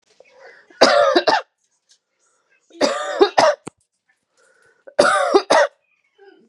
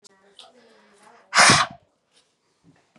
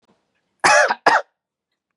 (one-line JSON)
{"three_cough_length": "6.5 s", "three_cough_amplitude": 32768, "three_cough_signal_mean_std_ratio": 0.41, "exhalation_length": "3.0 s", "exhalation_amplitude": 26788, "exhalation_signal_mean_std_ratio": 0.27, "cough_length": "2.0 s", "cough_amplitude": 32624, "cough_signal_mean_std_ratio": 0.38, "survey_phase": "beta (2021-08-13 to 2022-03-07)", "age": "18-44", "gender": "Female", "wearing_mask": "Yes", "symptom_cough_any": true, "symptom_runny_or_blocked_nose": true, "symptom_fatigue": true, "symptom_headache": true, "symptom_change_to_sense_of_smell_or_taste": true, "symptom_loss_of_taste": true, "smoker_status": "Never smoked", "respiratory_condition_asthma": false, "respiratory_condition_other": false, "recruitment_source": "Test and Trace", "submission_delay": "2 days", "covid_test_result": "Positive", "covid_test_method": "RT-qPCR", "covid_ct_value": 24.8, "covid_ct_gene": "ORF1ab gene", "covid_ct_mean": 25.2, "covid_viral_load": "5300 copies/ml", "covid_viral_load_category": "Minimal viral load (< 10K copies/ml)"}